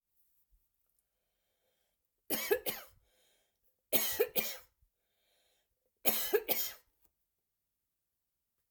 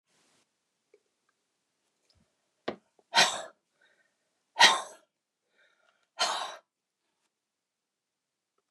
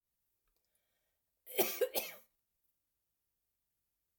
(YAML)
three_cough_length: 8.7 s
three_cough_amplitude: 7085
three_cough_signal_mean_std_ratio: 0.3
exhalation_length: 8.7 s
exhalation_amplitude: 21210
exhalation_signal_mean_std_ratio: 0.2
cough_length: 4.2 s
cough_amplitude: 5531
cough_signal_mean_std_ratio: 0.24
survey_phase: alpha (2021-03-01 to 2021-08-12)
age: 65+
gender: Female
wearing_mask: 'No'
symptom_none: true
smoker_status: Ex-smoker
respiratory_condition_asthma: false
respiratory_condition_other: false
recruitment_source: REACT
submission_delay: 1 day
covid_test_result: Negative
covid_test_method: RT-qPCR